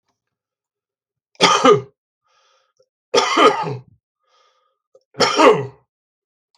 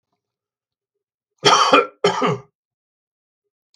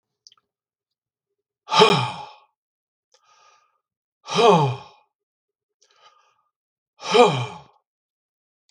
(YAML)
three_cough_length: 6.6 s
three_cough_amplitude: 32768
three_cough_signal_mean_std_ratio: 0.35
cough_length: 3.8 s
cough_amplitude: 32768
cough_signal_mean_std_ratio: 0.34
exhalation_length: 8.7 s
exhalation_amplitude: 32768
exhalation_signal_mean_std_ratio: 0.28
survey_phase: beta (2021-08-13 to 2022-03-07)
age: 65+
gender: Male
wearing_mask: 'No'
symptom_none: true
smoker_status: Never smoked
respiratory_condition_asthma: false
respiratory_condition_other: false
recruitment_source: REACT
submission_delay: 3 days
covid_test_result: Negative
covid_test_method: RT-qPCR
influenza_a_test_result: Negative
influenza_b_test_result: Negative